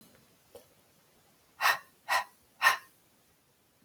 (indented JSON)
{
  "exhalation_length": "3.8 s",
  "exhalation_amplitude": 10505,
  "exhalation_signal_mean_std_ratio": 0.28,
  "survey_phase": "alpha (2021-03-01 to 2021-08-12)",
  "age": "18-44",
  "gender": "Female",
  "wearing_mask": "No",
  "symptom_cough_any": true,
  "smoker_status": "Never smoked",
  "respiratory_condition_asthma": false,
  "respiratory_condition_other": false,
  "recruitment_source": "REACT",
  "submission_delay": "4 days",
  "covid_test_result": "Negative",
  "covid_test_method": "RT-qPCR"
}